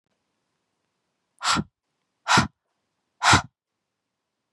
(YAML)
exhalation_length: 4.5 s
exhalation_amplitude: 23666
exhalation_signal_mean_std_ratio: 0.26
survey_phase: beta (2021-08-13 to 2022-03-07)
age: 18-44
gender: Female
wearing_mask: 'No'
symptom_cough_any: true
symptom_runny_or_blocked_nose: true
symptom_shortness_of_breath: true
symptom_sore_throat: true
symptom_fatigue: true
symptom_fever_high_temperature: true
symptom_headache: true
smoker_status: Never smoked
respiratory_condition_asthma: false
respiratory_condition_other: false
recruitment_source: Test and Trace
submission_delay: 2 days
covid_test_result: Positive
covid_test_method: RT-qPCR
covid_ct_value: 24.3
covid_ct_gene: ORF1ab gene
covid_ct_mean: 24.4
covid_viral_load: 10000 copies/ml
covid_viral_load_category: Minimal viral load (< 10K copies/ml)